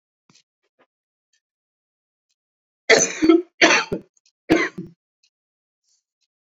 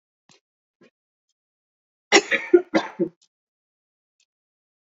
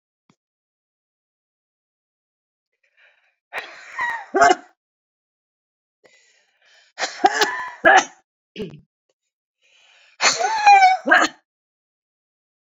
{
  "cough_length": "6.6 s",
  "cough_amplitude": 29283,
  "cough_signal_mean_std_ratio": 0.28,
  "three_cough_length": "4.9 s",
  "three_cough_amplitude": 29286,
  "three_cough_signal_mean_std_ratio": 0.22,
  "exhalation_length": "12.6 s",
  "exhalation_amplitude": 28800,
  "exhalation_signal_mean_std_ratio": 0.3,
  "survey_phase": "beta (2021-08-13 to 2022-03-07)",
  "age": "45-64",
  "gender": "Female",
  "wearing_mask": "No",
  "symptom_cough_any": true,
  "symptom_runny_or_blocked_nose": true,
  "symptom_onset": "5 days",
  "smoker_status": "Ex-smoker",
  "respiratory_condition_asthma": false,
  "respiratory_condition_other": false,
  "recruitment_source": "Test and Trace",
  "submission_delay": "1 day",
  "covid_test_result": "Positive",
  "covid_test_method": "RT-qPCR",
  "covid_ct_value": 19.3,
  "covid_ct_gene": "ORF1ab gene",
  "covid_ct_mean": 20.3,
  "covid_viral_load": "210000 copies/ml",
  "covid_viral_load_category": "Low viral load (10K-1M copies/ml)"
}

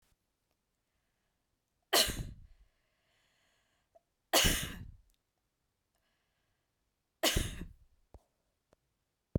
{
  "three_cough_length": "9.4 s",
  "three_cough_amplitude": 8319,
  "three_cough_signal_mean_std_ratio": 0.25,
  "survey_phase": "beta (2021-08-13 to 2022-03-07)",
  "age": "18-44",
  "gender": "Female",
  "wearing_mask": "No",
  "symptom_none": true,
  "smoker_status": "Never smoked",
  "respiratory_condition_asthma": false,
  "respiratory_condition_other": false,
  "recruitment_source": "REACT",
  "submission_delay": "1 day",
  "covid_test_result": "Negative",
  "covid_test_method": "RT-qPCR"
}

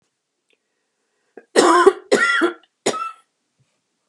{
  "three_cough_length": "4.1 s",
  "three_cough_amplitude": 32691,
  "three_cough_signal_mean_std_ratio": 0.37,
  "survey_phase": "beta (2021-08-13 to 2022-03-07)",
  "age": "45-64",
  "gender": "Female",
  "wearing_mask": "No",
  "symptom_cough_any": true,
  "smoker_status": "Ex-smoker",
  "respiratory_condition_asthma": false,
  "respiratory_condition_other": false,
  "recruitment_source": "REACT",
  "submission_delay": "1 day",
  "covid_test_result": "Negative",
  "covid_test_method": "RT-qPCR",
  "influenza_a_test_result": "Negative",
  "influenza_b_test_result": "Negative"
}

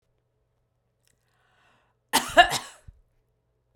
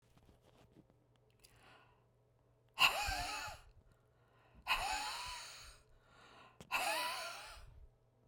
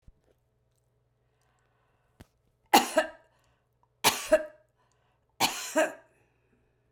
{
  "cough_length": "3.8 s",
  "cough_amplitude": 25037,
  "cough_signal_mean_std_ratio": 0.2,
  "exhalation_length": "8.3 s",
  "exhalation_amplitude": 4979,
  "exhalation_signal_mean_std_ratio": 0.42,
  "three_cough_length": "6.9 s",
  "three_cough_amplitude": 17802,
  "three_cough_signal_mean_std_ratio": 0.26,
  "survey_phase": "beta (2021-08-13 to 2022-03-07)",
  "age": "65+",
  "gender": "Female",
  "wearing_mask": "No",
  "symptom_none": true,
  "smoker_status": "Ex-smoker",
  "respiratory_condition_asthma": false,
  "respiratory_condition_other": true,
  "recruitment_source": "REACT",
  "submission_delay": "1 day",
  "covid_test_result": "Negative",
  "covid_test_method": "RT-qPCR"
}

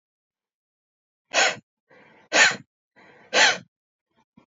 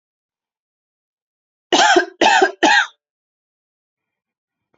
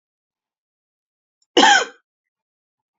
{
  "exhalation_length": "4.5 s",
  "exhalation_amplitude": 21895,
  "exhalation_signal_mean_std_ratio": 0.3,
  "three_cough_length": "4.8 s",
  "three_cough_amplitude": 29142,
  "three_cough_signal_mean_std_ratio": 0.34,
  "cough_length": "3.0 s",
  "cough_amplitude": 28761,
  "cough_signal_mean_std_ratio": 0.24,
  "survey_phase": "beta (2021-08-13 to 2022-03-07)",
  "age": "18-44",
  "gender": "Female",
  "wearing_mask": "No",
  "symptom_none": true,
  "smoker_status": "Never smoked",
  "respiratory_condition_asthma": false,
  "respiratory_condition_other": false,
  "recruitment_source": "REACT",
  "submission_delay": "2 days",
  "covid_test_result": "Negative",
  "covid_test_method": "RT-qPCR"
}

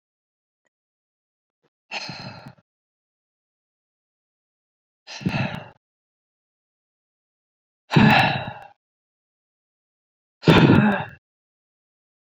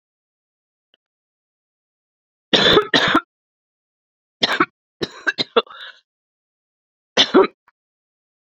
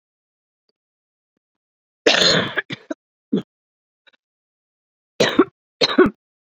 {
  "exhalation_length": "12.3 s",
  "exhalation_amplitude": 26351,
  "exhalation_signal_mean_std_ratio": 0.26,
  "three_cough_length": "8.5 s",
  "three_cough_amplitude": 32245,
  "three_cough_signal_mean_std_ratio": 0.29,
  "cough_length": "6.6 s",
  "cough_amplitude": 28507,
  "cough_signal_mean_std_ratio": 0.3,
  "survey_phase": "beta (2021-08-13 to 2022-03-07)",
  "age": "18-44",
  "gender": "Female",
  "wearing_mask": "No",
  "symptom_cough_any": true,
  "symptom_runny_or_blocked_nose": true,
  "symptom_sore_throat": true,
  "symptom_headache": true,
  "symptom_change_to_sense_of_smell_or_taste": true,
  "symptom_loss_of_taste": true,
  "smoker_status": "Current smoker (1 to 10 cigarettes per day)",
  "respiratory_condition_asthma": false,
  "respiratory_condition_other": true,
  "recruitment_source": "Test and Trace",
  "submission_delay": "1 day",
  "covid_test_result": "Positive",
  "covid_test_method": "LFT"
}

